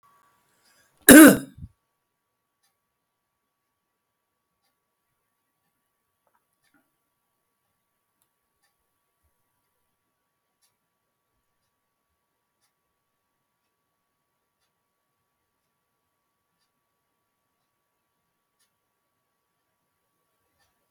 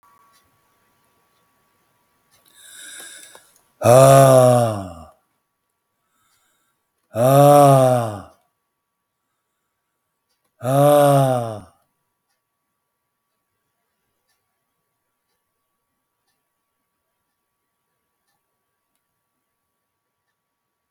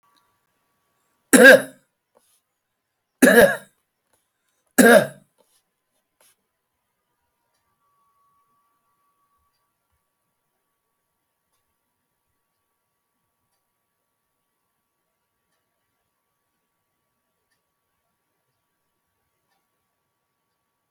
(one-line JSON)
{"cough_length": "20.9 s", "cough_amplitude": 32768, "cough_signal_mean_std_ratio": 0.1, "exhalation_length": "20.9 s", "exhalation_amplitude": 30994, "exhalation_signal_mean_std_ratio": 0.29, "three_cough_length": "20.9 s", "three_cough_amplitude": 32768, "three_cough_signal_mean_std_ratio": 0.16, "survey_phase": "alpha (2021-03-01 to 2021-08-12)", "age": "65+", "gender": "Male", "wearing_mask": "No", "symptom_none": true, "smoker_status": "Ex-smoker", "respiratory_condition_asthma": false, "respiratory_condition_other": false, "recruitment_source": "REACT", "submission_delay": "1 day", "covid_test_result": "Negative", "covid_test_method": "RT-qPCR"}